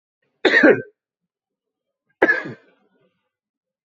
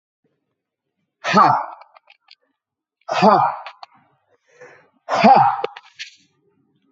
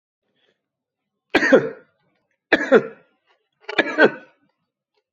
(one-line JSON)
{"cough_length": "3.8 s", "cough_amplitude": 27923, "cough_signal_mean_std_ratio": 0.29, "exhalation_length": "6.9 s", "exhalation_amplitude": 28538, "exhalation_signal_mean_std_ratio": 0.35, "three_cough_length": "5.1 s", "three_cough_amplitude": 28475, "three_cough_signal_mean_std_ratio": 0.3, "survey_phase": "beta (2021-08-13 to 2022-03-07)", "age": "45-64", "gender": "Male", "wearing_mask": "No", "symptom_none": true, "smoker_status": "Ex-smoker", "respiratory_condition_asthma": false, "respiratory_condition_other": false, "recruitment_source": "REACT", "submission_delay": "3 days", "covid_test_result": "Negative", "covid_test_method": "RT-qPCR", "influenza_a_test_result": "Negative", "influenza_b_test_result": "Negative"}